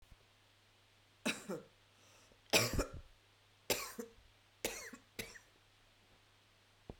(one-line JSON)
{"three_cough_length": "7.0 s", "three_cough_amplitude": 4909, "three_cough_signal_mean_std_ratio": 0.32, "survey_phase": "beta (2021-08-13 to 2022-03-07)", "age": "45-64", "gender": "Female", "wearing_mask": "No", "symptom_runny_or_blocked_nose": true, "symptom_sore_throat": true, "symptom_fever_high_temperature": true, "symptom_headache": true, "symptom_change_to_sense_of_smell_or_taste": true, "symptom_loss_of_taste": true, "symptom_onset": "3 days", "smoker_status": "Ex-smoker", "respiratory_condition_asthma": false, "respiratory_condition_other": false, "recruitment_source": "Test and Trace", "submission_delay": "2 days", "covid_test_result": "Positive", "covid_test_method": "RT-qPCR", "covid_ct_value": 15.5, "covid_ct_gene": "ORF1ab gene", "covid_ct_mean": 16.0, "covid_viral_load": "5600000 copies/ml", "covid_viral_load_category": "High viral load (>1M copies/ml)"}